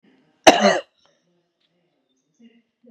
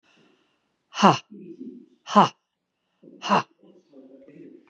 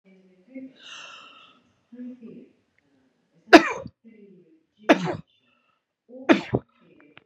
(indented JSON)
{
  "cough_length": "2.9 s",
  "cough_amplitude": 32768,
  "cough_signal_mean_std_ratio": 0.23,
  "exhalation_length": "4.7 s",
  "exhalation_amplitude": 29280,
  "exhalation_signal_mean_std_ratio": 0.26,
  "three_cough_length": "7.3 s",
  "three_cough_amplitude": 32768,
  "three_cough_signal_mean_std_ratio": 0.2,
  "survey_phase": "beta (2021-08-13 to 2022-03-07)",
  "age": "45-64",
  "gender": "Female",
  "wearing_mask": "No",
  "symptom_none": true,
  "smoker_status": "Never smoked",
  "respiratory_condition_asthma": false,
  "respiratory_condition_other": false,
  "recruitment_source": "REACT",
  "submission_delay": "2 days",
  "covid_test_result": "Negative",
  "covid_test_method": "RT-qPCR",
  "influenza_a_test_result": "Negative",
  "influenza_b_test_result": "Negative"
}